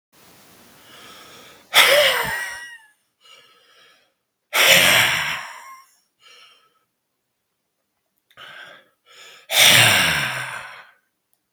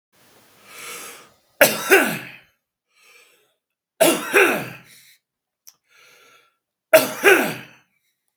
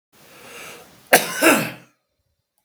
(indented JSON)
{
  "exhalation_length": "11.5 s",
  "exhalation_amplitude": 32768,
  "exhalation_signal_mean_std_ratio": 0.39,
  "three_cough_length": "8.4 s",
  "three_cough_amplitude": 32768,
  "three_cough_signal_mean_std_ratio": 0.33,
  "cough_length": "2.6 s",
  "cough_amplitude": 32768,
  "cough_signal_mean_std_ratio": 0.33,
  "survey_phase": "beta (2021-08-13 to 2022-03-07)",
  "age": "65+",
  "gender": "Male",
  "wearing_mask": "No",
  "symptom_none": true,
  "symptom_onset": "3 days",
  "smoker_status": "Ex-smoker",
  "respiratory_condition_asthma": false,
  "respiratory_condition_other": false,
  "recruitment_source": "REACT",
  "submission_delay": "2 days",
  "covid_test_result": "Negative",
  "covid_test_method": "RT-qPCR",
  "influenza_a_test_result": "Negative",
  "influenza_b_test_result": "Negative"
}